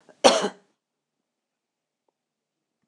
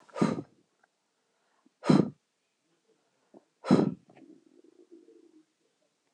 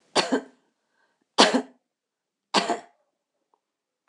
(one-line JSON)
{"cough_length": "2.9 s", "cough_amplitude": 26028, "cough_signal_mean_std_ratio": 0.2, "exhalation_length": "6.1 s", "exhalation_amplitude": 12276, "exhalation_signal_mean_std_ratio": 0.24, "three_cough_length": "4.1 s", "three_cough_amplitude": 26028, "three_cough_signal_mean_std_ratio": 0.28, "survey_phase": "beta (2021-08-13 to 2022-03-07)", "age": "45-64", "gender": "Female", "wearing_mask": "No", "symptom_none": true, "smoker_status": "Ex-smoker", "respiratory_condition_asthma": false, "respiratory_condition_other": false, "recruitment_source": "REACT", "submission_delay": "3 days", "covid_test_result": "Negative", "covid_test_method": "RT-qPCR", "influenza_a_test_result": "Unknown/Void", "influenza_b_test_result": "Unknown/Void"}